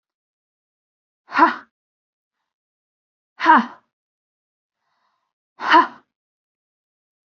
{"exhalation_length": "7.3 s", "exhalation_amplitude": 27612, "exhalation_signal_mean_std_ratio": 0.23, "survey_phase": "beta (2021-08-13 to 2022-03-07)", "age": "18-44", "gender": "Female", "wearing_mask": "No", "symptom_none": true, "smoker_status": "Never smoked", "respiratory_condition_asthma": false, "respiratory_condition_other": false, "recruitment_source": "REACT", "submission_delay": "1 day", "covid_test_result": "Negative", "covid_test_method": "RT-qPCR", "influenza_a_test_result": "Negative", "influenza_b_test_result": "Negative"}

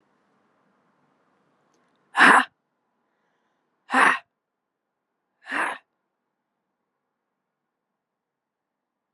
{"exhalation_length": "9.1 s", "exhalation_amplitude": 27563, "exhalation_signal_mean_std_ratio": 0.2, "survey_phase": "alpha (2021-03-01 to 2021-08-12)", "age": "18-44", "gender": "Female", "wearing_mask": "No", "symptom_cough_any": true, "symptom_shortness_of_breath": true, "symptom_fatigue": true, "symptom_onset": "2 days", "smoker_status": "Current smoker (e-cigarettes or vapes only)", "respiratory_condition_asthma": false, "respiratory_condition_other": false, "recruitment_source": "Test and Trace", "submission_delay": "2 days", "covid_test_result": "Positive", "covid_test_method": "RT-qPCR", "covid_ct_value": 30.0, "covid_ct_gene": "ORF1ab gene", "covid_ct_mean": 31.2, "covid_viral_load": "60 copies/ml", "covid_viral_load_category": "Minimal viral load (< 10K copies/ml)"}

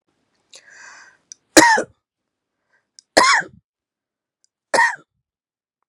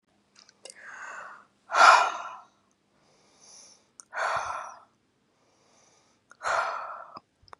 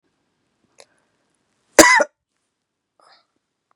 {"three_cough_length": "5.9 s", "three_cough_amplitude": 32768, "three_cough_signal_mean_std_ratio": 0.27, "exhalation_length": "7.6 s", "exhalation_amplitude": 24309, "exhalation_signal_mean_std_ratio": 0.3, "cough_length": "3.8 s", "cough_amplitude": 32768, "cough_signal_mean_std_ratio": 0.19, "survey_phase": "beta (2021-08-13 to 2022-03-07)", "age": "45-64", "gender": "Female", "wearing_mask": "No", "symptom_none": true, "symptom_onset": "12 days", "smoker_status": "Never smoked", "respiratory_condition_asthma": true, "respiratory_condition_other": false, "recruitment_source": "REACT", "submission_delay": "2 days", "covid_test_result": "Negative", "covid_test_method": "RT-qPCR", "influenza_a_test_result": "Negative", "influenza_b_test_result": "Negative"}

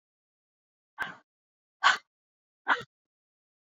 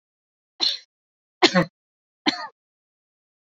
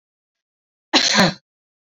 {"exhalation_length": "3.7 s", "exhalation_amplitude": 11870, "exhalation_signal_mean_std_ratio": 0.21, "three_cough_length": "3.4 s", "three_cough_amplitude": 27679, "three_cough_signal_mean_std_ratio": 0.26, "cough_length": "2.0 s", "cough_amplitude": 27392, "cough_signal_mean_std_ratio": 0.35, "survey_phase": "beta (2021-08-13 to 2022-03-07)", "age": "18-44", "gender": "Female", "wearing_mask": "No", "symptom_none": true, "smoker_status": "Never smoked", "respiratory_condition_asthma": false, "respiratory_condition_other": false, "recruitment_source": "REACT", "submission_delay": "1 day", "covid_test_result": "Negative", "covid_test_method": "RT-qPCR"}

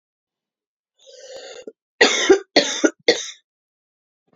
{"three_cough_length": "4.4 s", "three_cough_amplitude": 28745, "three_cough_signal_mean_std_ratio": 0.32, "survey_phase": "beta (2021-08-13 to 2022-03-07)", "age": "18-44", "gender": "Female", "wearing_mask": "No", "symptom_runny_or_blocked_nose": true, "symptom_sore_throat": true, "symptom_fatigue": true, "symptom_headache": true, "symptom_onset": "3 days", "smoker_status": "Never smoked", "respiratory_condition_asthma": false, "respiratory_condition_other": false, "recruitment_source": "Test and Trace", "submission_delay": "1 day", "covid_test_result": "Positive", "covid_test_method": "RT-qPCR", "covid_ct_value": 22.7, "covid_ct_gene": "N gene"}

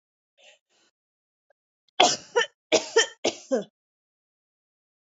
{"three_cough_length": "5.0 s", "three_cough_amplitude": 26125, "three_cough_signal_mean_std_ratio": 0.27, "survey_phase": "beta (2021-08-13 to 2022-03-07)", "age": "45-64", "gender": "Female", "wearing_mask": "No", "symptom_cough_any": true, "smoker_status": "Never smoked", "respiratory_condition_asthma": false, "respiratory_condition_other": false, "recruitment_source": "REACT", "submission_delay": "3 days", "covid_test_result": "Negative", "covid_test_method": "RT-qPCR"}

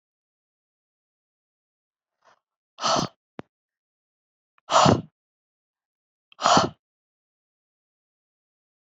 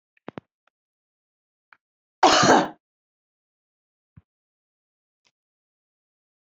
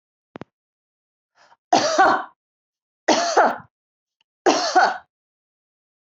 {"exhalation_length": "8.9 s", "exhalation_amplitude": 27591, "exhalation_signal_mean_std_ratio": 0.22, "cough_length": "6.5 s", "cough_amplitude": 22391, "cough_signal_mean_std_ratio": 0.2, "three_cough_length": "6.1 s", "three_cough_amplitude": 24651, "three_cough_signal_mean_std_ratio": 0.37, "survey_phase": "alpha (2021-03-01 to 2021-08-12)", "age": "45-64", "gender": "Female", "wearing_mask": "No", "symptom_none": true, "smoker_status": "Never smoked", "respiratory_condition_asthma": false, "respiratory_condition_other": false, "recruitment_source": "REACT", "submission_delay": "1 day", "covid_test_result": "Negative", "covid_test_method": "RT-qPCR"}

